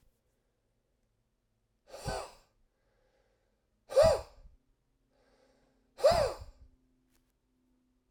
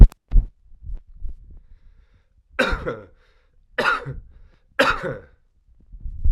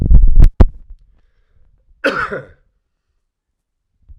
{"exhalation_length": "8.1 s", "exhalation_amplitude": 7436, "exhalation_signal_mean_std_ratio": 0.24, "three_cough_length": "6.3 s", "three_cough_amplitude": 32768, "three_cough_signal_mean_std_ratio": 0.3, "cough_length": "4.2 s", "cough_amplitude": 32768, "cough_signal_mean_std_ratio": 0.36, "survey_phase": "alpha (2021-03-01 to 2021-08-12)", "age": "45-64", "gender": "Male", "wearing_mask": "No", "symptom_cough_any": true, "symptom_fatigue": true, "symptom_headache": true, "symptom_change_to_sense_of_smell_or_taste": true, "symptom_loss_of_taste": true, "symptom_onset": "5 days", "smoker_status": "Ex-smoker", "respiratory_condition_asthma": false, "respiratory_condition_other": false, "recruitment_source": "Test and Trace", "submission_delay": "1 day", "covid_test_result": "Positive", "covid_test_method": "RT-qPCR"}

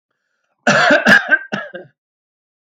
{"cough_length": "2.6 s", "cough_amplitude": 32515, "cough_signal_mean_std_ratio": 0.44, "survey_phase": "alpha (2021-03-01 to 2021-08-12)", "age": "45-64", "gender": "Male", "wearing_mask": "No", "symptom_none": true, "smoker_status": "Never smoked", "respiratory_condition_asthma": false, "respiratory_condition_other": false, "recruitment_source": "REACT", "submission_delay": "1 day", "covid_test_result": "Negative", "covid_test_method": "RT-qPCR"}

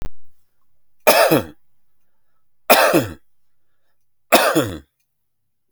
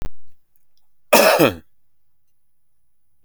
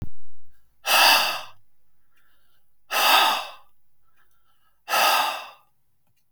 {"three_cough_length": "5.7 s", "three_cough_amplitude": 32768, "three_cough_signal_mean_std_ratio": 0.4, "cough_length": "3.2 s", "cough_amplitude": 32768, "cough_signal_mean_std_ratio": 0.39, "exhalation_length": "6.3 s", "exhalation_amplitude": 22390, "exhalation_signal_mean_std_ratio": 0.53, "survey_phase": "beta (2021-08-13 to 2022-03-07)", "age": "45-64", "gender": "Male", "wearing_mask": "No", "symptom_none": true, "symptom_onset": "7 days", "smoker_status": "Current smoker (11 or more cigarettes per day)", "respiratory_condition_asthma": false, "respiratory_condition_other": false, "recruitment_source": "REACT", "submission_delay": "1 day", "covid_test_result": "Negative", "covid_test_method": "RT-qPCR"}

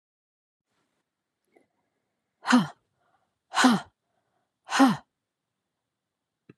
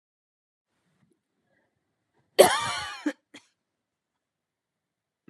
{"exhalation_length": "6.6 s", "exhalation_amplitude": 19324, "exhalation_signal_mean_std_ratio": 0.25, "cough_length": "5.3 s", "cough_amplitude": 29709, "cough_signal_mean_std_ratio": 0.19, "survey_phase": "beta (2021-08-13 to 2022-03-07)", "age": "45-64", "gender": "Female", "wearing_mask": "No", "symptom_fatigue": true, "symptom_onset": "12 days", "smoker_status": "Never smoked", "respiratory_condition_asthma": false, "respiratory_condition_other": false, "recruitment_source": "REACT", "submission_delay": "2 days", "covid_test_result": "Negative", "covid_test_method": "RT-qPCR"}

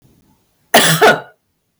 {"cough_length": "1.8 s", "cough_amplitude": 32768, "cough_signal_mean_std_ratio": 0.42, "survey_phase": "beta (2021-08-13 to 2022-03-07)", "age": "18-44", "gender": "Female", "wearing_mask": "No", "symptom_headache": true, "smoker_status": "Ex-smoker", "respiratory_condition_asthma": false, "respiratory_condition_other": false, "recruitment_source": "REACT", "submission_delay": "8 days", "covid_test_result": "Negative", "covid_test_method": "RT-qPCR", "influenza_a_test_result": "Negative", "influenza_b_test_result": "Negative"}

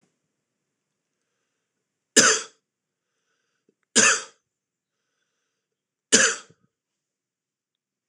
{"three_cough_length": "8.1 s", "three_cough_amplitude": 26028, "three_cough_signal_mean_std_ratio": 0.22, "survey_phase": "beta (2021-08-13 to 2022-03-07)", "age": "45-64", "gender": "Male", "wearing_mask": "No", "symptom_cough_any": true, "symptom_runny_or_blocked_nose": true, "smoker_status": "Never smoked", "respiratory_condition_asthma": false, "respiratory_condition_other": false, "recruitment_source": "Test and Trace", "submission_delay": "2 days", "covid_test_result": "Positive", "covid_test_method": "RT-qPCR", "covid_ct_value": 27.6, "covid_ct_gene": "ORF1ab gene"}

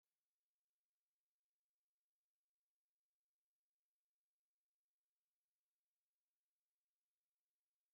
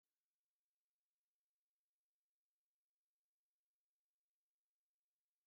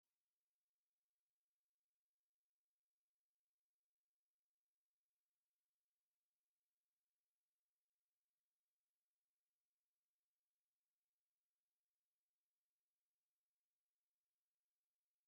{"three_cough_length": "7.9 s", "three_cough_amplitude": 2, "three_cough_signal_mean_std_ratio": 0.19, "cough_length": "5.5 s", "cough_amplitude": 2, "cough_signal_mean_std_ratio": 0.17, "exhalation_length": "15.3 s", "exhalation_amplitude": 2, "exhalation_signal_mean_std_ratio": 0.21, "survey_phase": "beta (2021-08-13 to 2022-03-07)", "age": "45-64", "gender": "Female", "wearing_mask": "No", "symptom_none": true, "smoker_status": "Never smoked", "respiratory_condition_asthma": false, "respiratory_condition_other": false, "recruitment_source": "REACT", "submission_delay": "1 day", "covid_test_result": "Negative", "covid_test_method": "RT-qPCR"}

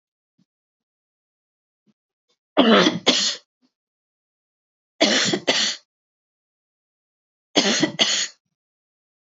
{"three_cough_length": "9.2 s", "three_cough_amplitude": 26978, "three_cough_signal_mean_std_ratio": 0.35, "survey_phase": "beta (2021-08-13 to 2022-03-07)", "age": "45-64", "gender": "Female", "wearing_mask": "No", "symptom_none": true, "smoker_status": "Never smoked", "respiratory_condition_asthma": false, "respiratory_condition_other": false, "recruitment_source": "REACT", "submission_delay": "1 day", "covid_test_result": "Negative", "covid_test_method": "RT-qPCR"}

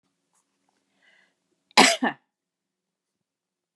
{"cough_length": "3.8 s", "cough_amplitude": 28816, "cough_signal_mean_std_ratio": 0.19, "survey_phase": "beta (2021-08-13 to 2022-03-07)", "age": "65+", "gender": "Female", "wearing_mask": "Yes", "symptom_none": true, "smoker_status": "Never smoked", "respiratory_condition_asthma": false, "respiratory_condition_other": false, "recruitment_source": "REACT", "submission_delay": "3 days", "covid_test_result": "Negative", "covid_test_method": "RT-qPCR"}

